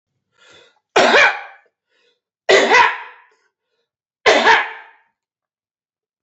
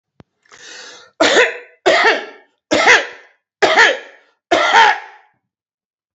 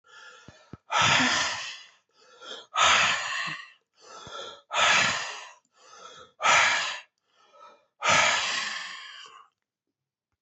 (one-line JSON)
{"three_cough_length": "6.2 s", "three_cough_amplitude": 32538, "three_cough_signal_mean_std_ratio": 0.38, "cough_length": "6.1 s", "cough_amplitude": 30470, "cough_signal_mean_std_ratio": 0.47, "exhalation_length": "10.4 s", "exhalation_amplitude": 13851, "exhalation_signal_mean_std_ratio": 0.5, "survey_phase": "alpha (2021-03-01 to 2021-08-12)", "age": "45-64", "gender": "Male", "wearing_mask": "No", "symptom_none": true, "smoker_status": "Current smoker (e-cigarettes or vapes only)", "respiratory_condition_asthma": false, "respiratory_condition_other": false, "recruitment_source": "REACT", "submission_delay": "3 days", "covid_test_result": "Negative", "covid_test_method": "RT-qPCR"}